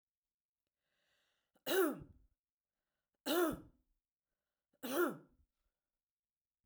three_cough_length: 6.7 s
three_cough_amplitude: 2352
three_cough_signal_mean_std_ratio: 0.3
survey_phase: beta (2021-08-13 to 2022-03-07)
age: 65+
gender: Female
wearing_mask: 'No'
symptom_none: true
smoker_status: Never smoked
respiratory_condition_asthma: false
respiratory_condition_other: false
recruitment_source: REACT
submission_delay: 2 days
covid_test_result: Negative
covid_test_method: RT-qPCR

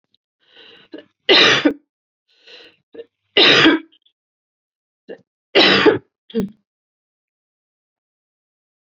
three_cough_length: 9.0 s
three_cough_amplitude: 30878
three_cough_signal_mean_std_ratio: 0.32
survey_phase: beta (2021-08-13 to 2022-03-07)
age: 65+
gender: Female
wearing_mask: 'No'
symptom_none: true
smoker_status: Ex-smoker
respiratory_condition_asthma: false
respiratory_condition_other: false
recruitment_source: REACT
submission_delay: 0 days
covid_test_result: Negative
covid_test_method: RT-qPCR
influenza_a_test_result: Negative
influenza_b_test_result: Negative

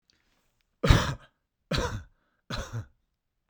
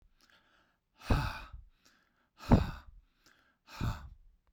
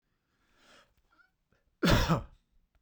three_cough_length: 3.5 s
three_cough_amplitude: 22399
three_cough_signal_mean_std_ratio: 0.31
exhalation_length: 4.5 s
exhalation_amplitude: 10289
exhalation_signal_mean_std_ratio: 0.29
cough_length: 2.8 s
cough_amplitude: 8233
cough_signal_mean_std_ratio: 0.3
survey_phase: beta (2021-08-13 to 2022-03-07)
age: 45-64
gender: Male
wearing_mask: 'No'
symptom_none: true
smoker_status: Never smoked
respiratory_condition_asthma: true
respiratory_condition_other: false
recruitment_source: REACT
submission_delay: 2 days
covid_test_result: Negative
covid_test_method: RT-qPCR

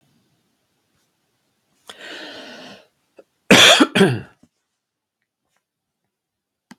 cough_length: 6.8 s
cough_amplitude: 32768
cough_signal_mean_std_ratio: 0.24
survey_phase: beta (2021-08-13 to 2022-03-07)
age: 65+
gender: Male
wearing_mask: 'No'
symptom_runny_or_blocked_nose: true
symptom_onset: 9 days
smoker_status: Ex-smoker
respiratory_condition_asthma: false
respiratory_condition_other: false
recruitment_source: REACT
submission_delay: 1 day
covid_test_result: Negative
covid_test_method: RT-qPCR
influenza_a_test_result: Negative
influenza_b_test_result: Negative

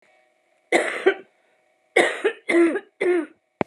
three_cough_length: 3.7 s
three_cough_amplitude: 26946
three_cough_signal_mean_std_ratio: 0.47
survey_phase: alpha (2021-03-01 to 2021-08-12)
age: 18-44
gender: Female
wearing_mask: 'No'
symptom_cough_any: true
symptom_abdominal_pain: true
symptom_fatigue: true
symptom_fever_high_temperature: true
symptom_headache: true
symptom_onset: 4 days
smoker_status: Ex-smoker
respiratory_condition_asthma: false
respiratory_condition_other: false
recruitment_source: Test and Trace
submission_delay: 2 days
covid_test_result: Positive
covid_test_method: RT-qPCR
covid_ct_value: 22.1
covid_ct_gene: ORF1ab gene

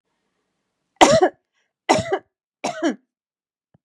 three_cough_length: 3.8 s
three_cough_amplitude: 32767
three_cough_signal_mean_std_ratio: 0.31
survey_phase: beta (2021-08-13 to 2022-03-07)
age: 45-64
gender: Female
wearing_mask: 'No'
symptom_none: true
smoker_status: Never smoked
respiratory_condition_asthma: false
respiratory_condition_other: false
recruitment_source: REACT
submission_delay: 5 days
covid_test_result: Negative
covid_test_method: RT-qPCR
influenza_a_test_result: Negative
influenza_b_test_result: Negative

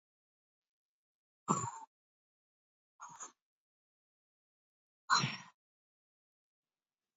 exhalation_length: 7.2 s
exhalation_amplitude: 5155
exhalation_signal_mean_std_ratio: 0.2
survey_phase: beta (2021-08-13 to 2022-03-07)
age: 65+
gender: Female
wearing_mask: 'No'
symptom_runny_or_blocked_nose: true
symptom_sore_throat: true
symptom_fatigue: true
symptom_other: true
smoker_status: Never smoked
respiratory_condition_asthma: true
respiratory_condition_other: false
recruitment_source: Test and Trace
submission_delay: 2 days
covid_test_result: Positive
covid_test_method: ePCR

